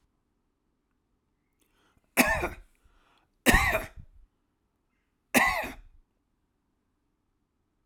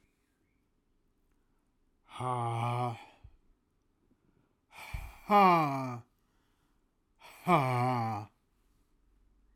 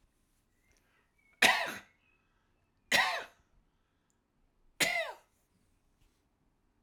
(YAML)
cough_length: 7.9 s
cough_amplitude: 16959
cough_signal_mean_std_ratio: 0.27
exhalation_length: 9.6 s
exhalation_amplitude: 7524
exhalation_signal_mean_std_ratio: 0.39
three_cough_length: 6.8 s
three_cough_amplitude: 10981
three_cough_signal_mean_std_ratio: 0.27
survey_phase: alpha (2021-03-01 to 2021-08-12)
age: 65+
gender: Male
wearing_mask: 'No'
symptom_none: true
smoker_status: Ex-smoker
respiratory_condition_asthma: false
respiratory_condition_other: false
recruitment_source: REACT
submission_delay: 1 day
covid_test_result: Negative
covid_test_method: RT-qPCR